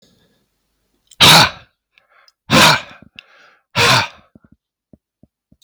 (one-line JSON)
{"exhalation_length": "5.6 s", "exhalation_amplitude": 32768, "exhalation_signal_mean_std_ratio": 0.34, "survey_phase": "beta (2021-08-13 to 2022-03-07)", "age": "45-64", "gender": "Male", "wearing_mask": "No", "symptom_none": true, "smoker_status": "Never smoked", "respiratory_condition_asthma": false, "respiratory_condition_other": false, "recruitment_source": "REACT", "submission_delay": "1 day", "covid_test_result": "Negative", "covid_test_method": "RT-qPCR", "influenza_a_test_result": "Negative", "influenza_b_test_result": "Negative"}